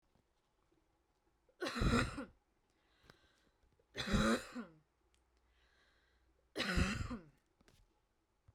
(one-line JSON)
{"three_cough_length": "8.5 s", "three_cough_amplitude": 3082, "three_cough_signal_mean_std_ratio": 0.35, "survey_phase": "beta (2021-08-13 to 2022-03-07)", "age": "18-44", "gender": "Female", "wearing_mask": "No", "symptom_runny_or_blocked_nose": true, "smoker_status": "Ex-smoker", "respiratory_condition_asthma": false, "respiratory_condition_other": false, "recruitment_source": "REACT", "submission_delay": "1 day", "covid_test_result": "Negative", "covid_test_method": "RT-qPCR", "influenza_a_test_result": "Unknown/Void", "influenza_b_test_result": "Unknown/Void"}